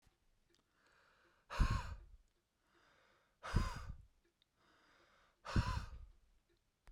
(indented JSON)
{
  "exhalation_length": "6.9 s",
  "exhalation_amplitude": 2674,
  "exhalation_signal_mean_std_ratio": 0.32,
  "survey_phase": "beta (2021-08-13 to 2022-03-07)",
  "age": "65+",
  "gender": "Male",
  "wearing_mask": "No",
  "symptom_none": true,
  "smoker_status": "Never smoked",
  "respiratory_condition_asthma": false,
  "respiratory_condition_other": false,
  "recruitment_source": "REACT",
  "submission_delay": "2 days",
  "covid_test_result": "Negative",
  "covid_test_method": "RT-qPCR"
}